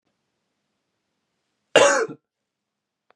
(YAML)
cough_length: 3.2 s
cough_amplitude: 31185
cough_signal_mean_std_ratio: 0.24
survey_phase: beta (2021-08-13 to 2022-03-07)
age: 18-44
gender: Male
wearing_mask: 'Yes'
symptom_runny_or_blocked_nose: true
symptom_headache: true
smoker_status: Never smoked
respiratory_condition_asthma: false
respiratory_condition_other: false
recruitment_source: Test and Trace
submission_delay: 2 days
covid_test_result: Positive
covid_test_method: RT-qPCR
covid_ct_value: 23.2
covid_ct_gene: ORF1ab gene